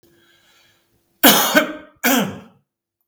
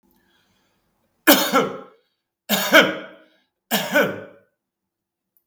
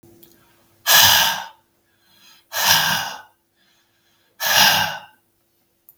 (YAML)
cough_length: 3.1 s
cough_amplitude: 32768
cough_signal_mean_std_ratio: 0.38
three_cough_length: 5.5 s
three_cough_amplitude: 32768
three_cough_signal_mean_std_ratio: 0.35
exhalation_length: 6.0 s
exhalation_amplitude: 32767
exhalation_signal_mean_std_ratio: 0.42
survey_phase: beta (2021-08-13 to 2022-03-07)
age: 65+
gender: Male
wearing_mask: 'No'
symptom_none: true
smoker_status: Never smoked
respiratory_condition_asthma: false
respiratory_condition_other: false
recruitment_source: REACT
submission_delay: 12 days
covid_test_result: Negative
covid_test_method: RT-qPCR
influenza_a_test_result: Unknown/Void
influenza_b_test_result: Unknown/Void